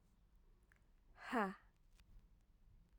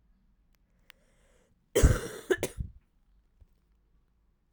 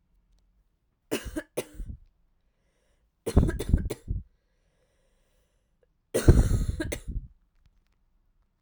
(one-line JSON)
{"exhalation_length": "3.0 s", "exhalation_amplitude": 1309, "exhalation_signal_mean_std_ratio": 0.31, "cough_length": "4.5 s", "cough_amplitude": 13528, "cough_signal_mean_std_ratio": 0.24, "three_cough_length": "8.6 s", "three_cough_amplitude": 23612, "three_cough_signal_mean_std_ratio": 0.3, "survey_phase": "alpha (2021-03-01 to 2021-08-12)", "age": "18-44", "gender": "Female", "wearing_mask": "No", "symptom_cough_any": true, "symptom_fatigue": true, "symptom_change_to_sense_of_smell_or_taste": true, "symptom_loss_of_taste": true, "symptom_onset": "4 days", "smoker_status": "Prefer not to say", "respiratory_condition_asthma": false, "respiratory_condition_other": false, "recruitment_source": "Test and Trace", "submission_delay": "2 days", "covid_test_result": "Positive", "covid_test_method": "RT-qPCR", "covid_ct_value": 15.1, "covid_ct_gene": "ORF1ab gene", "covid_ct_mean": 15.3, "covid_viral_load": "9500000 copies/ml", "covid_viral_load_category": "High viral load (>1M copies/ml)"}